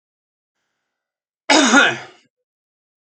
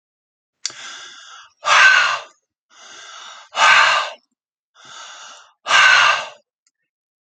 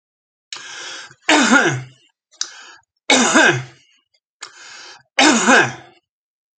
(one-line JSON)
{"cough_length": "3.1 s", "cough_amplitude": 32767, "cough_signal_mean_std_ratio": 0.31, "exhalation_length": "7.3 s", "exhalation_amplitude": 29590, "exhalation_signal_mean_std_ratio": 0.41, "three_cough_length": "6.6 s", "three_cough_amplitude": 32690, "three_cough_signal_mean_std_ratio": 0.43, "survey_phase": "alpha (2021-03-01 to 2021-08-12)", "age": "65+", "gender": "Male", "wearing_mask": "No", "symptom_none": true, "smoker_status": "Never smoked", "respiratory_condition_asthma": false, "respiratory_condition_other": false, "recruitment_source": "REACT", "submission_delay": "3 days", "covid_test_result": "Negative", "covid_test_method": "RT-qPCR"}